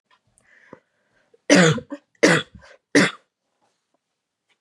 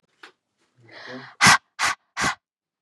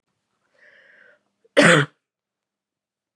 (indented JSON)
{
  "three_cough_length": "4.6 s",
  "three_cough_amplitude": 29675,
  "three_cough_signal_mean_std_ratio": 0.3,
  "exhalation_length": "2.8 s",
  "exhalation_amplitude": 29602,
  "exhalation_signal_mean_std_ratio": 0.31,
  "cough_length": "3.2 s",
  "cough_amplitude": 30479,
  "cough_signal_mean_std_ratio": 0.24,
  "survey_phase": "beta (2021-08-13 to 2022-03-07)",
  "age": "18-44",
  "gender": "Female",
  "wearing_mask": "No",
  "symptom_runny_or_blocked_nose": true,
  "symptom_fatigue": true,
  "symptom_headache": true,
  "symptom_other": true,
  "symptom_onset": "2 days",
  "smoker_status": "Never smoked",
  "respiratory_condition_asthma": false,
  "respiratory_condition_other": false,
  "recruitment_source": "Test and Trace",
  "submission_delay": "1 day",
  "covid_test_result": "Positive",
  "covid_test_method": "RT-qPCR",
  "covid_ct_value": 13.9,
  "covid_ct_gene": "N gene"
}